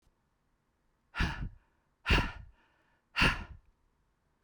{"exhalation_length": "4.4 s", "exhalation_amplitude": 8055, "exhalation_signal_mean_std_ratio": 0.32, "survey_phase": "beta (2021-08-13 to 2022-03-07)", "age": "65+", "gender": "Female", "wearing_mask": "No", "symptom_none": true, "smoker_status": "Never smoked", "respiratory_condition_asthma": false, "respiratory_condition_other": false, "recruitment_source": "REACT", "submission_delay": "1 day", "covid_test_result": "Negative", "covid_test_method": "RT-qPCR", "influenza_a_test_result": "Negative", "influenza_b_test_result": "Negative"}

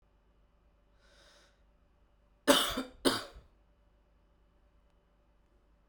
{"cough_length": "5.9 s", "cough_amplitude": 11216, "cough_signal_mean_std_ratio": 0.23, "survey_phase": "beta (2021-08-13 to 2022-03-07)", "age": "18-44", "gender": "Male", "wearing_mask": "No", "symptom_none": true, "smoker_status": "Never smoked", "respiratory_condition_asthma": false, "respiratory_condition_other": false, "recruitment_source": "REACT", "submission_delay": "2 days", "covid_test_result": "Negative", "covid_test_method": "RT-qPCR"}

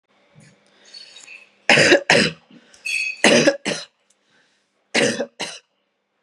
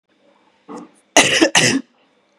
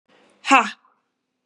{"three_cough_length": "6.2 s", "three_cough_amplitude": 32768, "three_cough_signal_mean_std_ratio": 0.39, "cough_length": "2.4 s", "cough_amplitude": 32768, "cough_signal_mean_std_ratio": 0.4, "exhalation_length": "1.5 s", "exhalation_amplitude": 31956, "exhalation_signal_mean_std_ratio": 0.27, "survey_phase": "beta (2021-08-13 to 2022-03-07)", "age": "45-64", "gender": "Female", "wearing_mask": "No", "symptom_cough_any": true, "symptom_runny_or_blocked_nose": true, "symptom_sore_throat": true, "smoker_status": "Ex-smoker", "respiratory_condition_asthma": false, "respiratory_condition_other": false, "recruitment_source": "Test and Trace", "submission_delay": "2 days", "covid_test_result": "Positive", "covid_test_method": "LFT"}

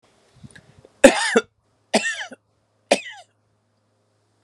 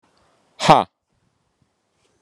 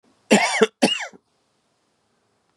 {"three_cough_length": "4.4 s", "three_cough_amplitude": 32768, "three_cough_signal_mean_std_ratio": 0.25, "exhalation_length": "2.2 s", "exhalation_amplitude": 32768, "exhalation_signal_mean_std_ratio": 0.2, "cough_length": "2.6 s", "cough_amplitude": 32170, "cough_signal_mean_std_ratio": 0.34, "survey_phase": "beta (2021-08-13 to 2022-03-07)", "age": "45-64", "gender": "Male", "wearing_mask": "No", "symptom_runny_or_blocked_nose": true, "symptom_sore_throat": true, "symptom_headache": true, "smoker_status": "Never smoked", "respiratory_condition_asthma": false, "respiratory_condition_other": false, "recruitment_source": "Test and Trace", "submission_delay": "1 day", "covid_test_result": "Positive", "covid_test_method": "RT-qPCR", "covid_ct_value": 23.5, "covid_ct_gene": "ORF1ab gene", "covid_ct_mean": 24.4, "covid_viral_load": "10000 copies/ml", "covid_viral_load_category": "Low viral load (10K-1M copies/ml)"}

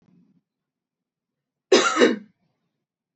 {"cough_length": "3.2 s", "cough_amplitude": 26094, "cough_signal_mean_std_ratio": 0.28, "survey_phase": "beta (2021-08-13 to 2022-03-07)", "age": "18-44", "gender": "Female", "wearing_mask": "No", "symptom_none": true, "smoker_status": "Never smoked", "respiratory_condition_asthma": true, "respiratory_condition_other": false, "recruitment_source": "REACT", "submission_delay": "2 days", "covid_test_result": "Negative", "covid_test_method": "RT-qPCR", "influenza_a_test_result": "Negative", "influenza_b_test_result": "Negative"}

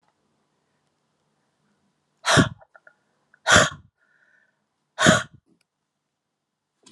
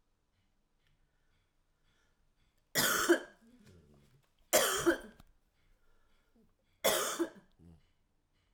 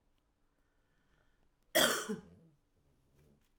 {"exhalation_length": "6.9 s", "exhalation_amplitude": 28373, "exhalation_signal_mean_std_ratio": 0.24, "three_cough_length": "8.5 s", "three_cough_amplitude": 7510, "three_cough_signal_mean_std_ratio": 0.31, "cough_length": "3.6 s", "cough_amplitude": 6940, "cough_signal_mean_std_ratio": 0.26, "survey_phase": "alpha (2021-03-01 to 2021-08-12)", "age": "45-64", "gender": "Female", "wearing_mask": "No", "symptom_shortness_of_breath": true, "symptom_change_to_sense_of_smell_or_taste": true, "smoker_status": "Never smoked", "respiratory_condition_asthma": false, "respiratory_condition_other": false, "recruitment_source": "Test and Trace", "submission_delay": "2 days", "covid_test_result": "Positive", "covid_test_method": "RT-qPCR", "covid_ct_value": 14.8, "covid_ct_gene": "ORF1ab gene", "covid_ct_mean": 15.1, "covid_viral_load": "11000000 copies/ml", "covid_viral_load_category": "High viral load (>1M copies/ml)"}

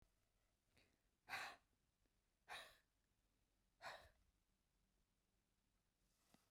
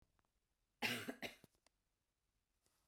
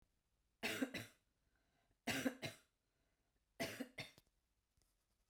{"exhalation_length": "6.5 s", "exhalation_amplitude": 405, "exhalation_signal_mean_std_ratio": 0.3, "cough_length": "2.9 s", "cough_amplitude": 1598, "cough_signal_mean_std_ratio": 0.29, "three_cough_length": "5.3 s", "three_cough_amplitude": 1451, "three_cough_signal_mean_std_ratio": 0.34, "survey_phase": "beta (2021-08-13 to 2022-03-07)", "age": "45-64", "gender": "Female", "wearing_mask": "No", "symptom_cough_any": true, "symptom_sore_throat": true, "symptom_fatigue": true, "symptom_other": true, "smoker_status": "Never smoked", "respiratory_condition_asthma": false, "respiratory_condition_other": false, "recruitment_source": "Test and Trace", "submission_delay": "1 day", "covid_test_result": "Positive", "covid_test_method": "RT-qPCR", "covid_ct_value": 27.0, "covid_ct_gene": "ORF1ab gene", "covid_ct_mean": 27.2, "covid_viral_load": "1200 copies/ml", "covid_viral_load_category": "Minimal viral load (< 10K copies/ml)"}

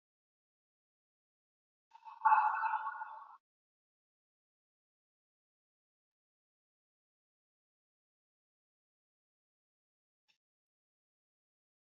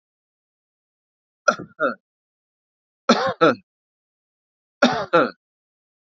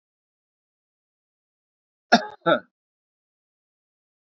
{"exhalation_length": "11.9 s", "exhalation_amplitude": 4637, "exhalation_signal_mean_std_ratio": 0.19, "three_cough_length": "6.1 s", "three_cough_amplitude": 29296, "three_cough_signal_mean_std_ratio": 0.28, "cough_length": "4.3 s", "cough_amplitude": 26519, "cough_signal_mean_std_ratio": 0.16, "survey_phase": "beta (2021-08-13 to 2022-03-07)", "age": "45-64", "gender": "Male", "wearing_mask": "No", "symptom_none": true, "smoker_status": "Ex-smoker", "respiratory_condition_asthma": false, "respiratory_condition_other": false, "recruitment_source": "REACT", "submission_delay": "2 days", "covid_test_result": "Negative", "covid_test_method": "RT-qPCR", "influenza_a_test_result": "Negative", "influenza_b_test_result": "Negative"}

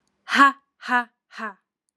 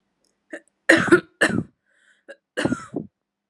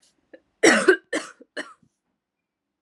{"exhalation_length": "2.0 s", "exhalation_amplitude": 26377, "exhalation_signal_mean_std_ratio": 0.34, "cough_length": "3.5 s", "cough_amplitude": 32202, "cough_signal_mean_std_ratio": 0.32, "three_cough_length": "2.8 s", "three_cough_amplitude": 27841, "three_cough_signal_mean_std_ratio": 0.29, "survey_phase": "alpha (2021-03-01 to 2021-08-12)", "age": "18-44", "gender": "Female", "wearing_mask": "No", "symptom_cough_any": true, "symptom_headache": true, "symptom_change_to_sense_of_smell_or_taste": true, "symptom_loss_of_taste": true, "symptom_onset": "2 days", "smoker_status": "Current smoker (e-cigarettes or vapes only)", "respiratory_condition_asthma": false, "respiratory_condition_other": false, "recruitment_source": "Test and Trace", "submission_delay": "1 day", "covid_ct_value": 32.8, "covid_ct_gene": "ORF1ab gene"}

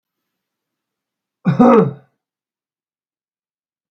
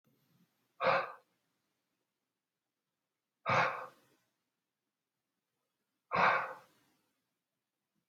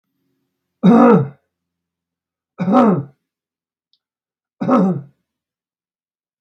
{"cough_length": "3.9 s", "cough_amplitude": 32768, "cough_signal_mean_std_ratio": 0.26, "exhalation_length": "8.1 s", "exhalation_amplitude": 5271, "exhalation_signal_mean_std_ratio": 0.27, "three_cough_length": "6.4 s", "three_cough_amplitude": 32767, "three_cough_signal_mean_std_ratio": 0.36, "survey_phase": "beta (2021-08-13 to 2022-03-07)", "age": "45-64", "gender": "Male", "wearing_mask": "No", "symptom_none": true, "smoker_status": "Never smoked", "respiratory_condition_asthma": false, "respiratory_condition_other": false, "recruitment_source": "REACT", "submission_delay": "2 days", "covid_test_result": "Negative", "covid_test_method": "RT-qPCR"}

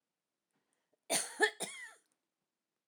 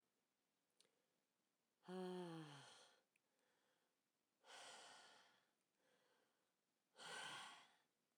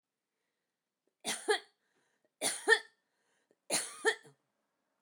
{"cough_length": "2.9 s", "cough_amplitude": 6758, "cough_signal_mean_std_ratio": 0.28, "exhalation_length": "8.2 s", "exhalation_amplitude": 219, "exhalation_signal_mean_std_ratio": 0.43, "three_cough_length": "5.0 s", "three_cough_amplitude": 7876, "three_cough_signal_mean_std_ratio": 0.29, "survey_phase": "alpha (2021-03-01 to 2021-08-12)", "age": "45-64", "gender": "Female", "wearing_mask": "No", "symptom_none": true, "smoker_status": "Ex-smoker", "respiratory_condition_asthma": false, "respiratory_condition_other": false, "recruitment_source": "REACT", "submission_delay": "2 days", "covid_test_result": "Negative", "covid_test_method": "RT-qPCR"}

